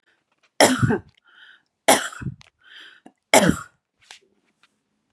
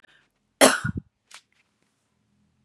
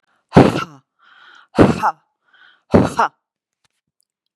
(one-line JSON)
{"three_cough_length": "5.1 s", "three_cough_amplitude": 32767, "three_cough_signal_mean_std_ratio": 0.3, "cough_length": "2.6 s", "cough_amplitude": 32767, "cough_signal_mean_std_ratio": 0.22, "exhalation_length": "4.4 s", "exhalation_amplitude": 32768, "exhalation_signal_mean_std_ratio": 0.31, "survey_phase": "beta (2021-08-13 to 2022-03-07)", "age": "45-64", "gender": "Female", "wearing_mask": "No", "symptom_other": true, "symptom_onset": "12 days", "smoker_status": "Ex-smoker", "respiratory_condition_asthma": false, "respiratory_condition_other": false, "recruitment_source": "REACT", "submission_delay": "3 days", "covid_test_result": "Negative", "covid_test_method": "RT-qPCR", "influenza_a_test_result": "Negative", "influenza_b_test_result": "Negative"}